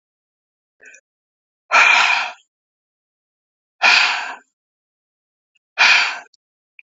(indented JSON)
{
  "exhalation_length": "6.9 s",
  "exhalation_amplitude": 30563,
  "exhalation_signal_mean_std_ratio": 0.35,
  "survey_phase": "beta (2021-08-13 to 2022-03-07)",
  "age": "45-64",
  "gender": "Female",
  "wearing_mask": "No",
  "symptom_none": true,
  "symptom_onset": "12 days",
  "smoker_status": "Never smoked",
  "respiratory_condition_asthma": false,
  "respiratory_condition_other": false,
  "recruitment_source": "REACT",
  "submission_delay": "2 days",
  "covid_test_result": "Negative",
  "covid_test_method": "RT-qPCR"
}